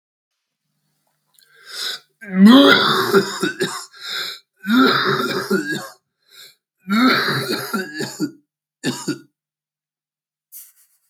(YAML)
three_cough_length: 11.1 s
three_cough_amplitude: 32766
three_cough_signal_mean_std_ratio: 0.45
survey_phase: beta (2021-08-13 to 2022-03-07)
age: 45-64
gender: Male
wearing_mask: 'No'
symptom_cough_any: true
symptom_new_continuous_cough: true
symptom_shortness_of_breath: true
symptom_sore_throat: true
symptom_fatigue: true
symptom_headache: true
smoker_status: Never smoked
respiratory_condition_asthma: true
respiratory_condition_other: true
recruitment_source: Test and Trace
submission_delay: 0 days
covid_test_result: Positive
covid_test_method: LFT